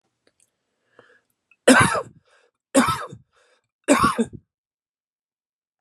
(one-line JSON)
{"three_cough_length": "5.8 s", "three_cough_amplitude": 32767, "three_cough_signal_mean_std_ratio": 0.3, "survey_phase": "beta (2021-08-13 to 2022-03-07)", "age": "18-44", "gender": "Male", "wearing_mask": "No", "symptom_cough_any": true, "symptom_fatigue": true, "symptom_onset": "10 days", "smoker_status": "Never smoked", "respiratory_condition_asthma": false, "respiratory_condition_other": false, "recruitment_source": "REACT", "submission_delay": "2 days", "covid_test_result": "Negative", "covid_test_method": "RT-qPCR", "influenza_a_test_result": "Negative", "influenza_b_test_result": "Negative"}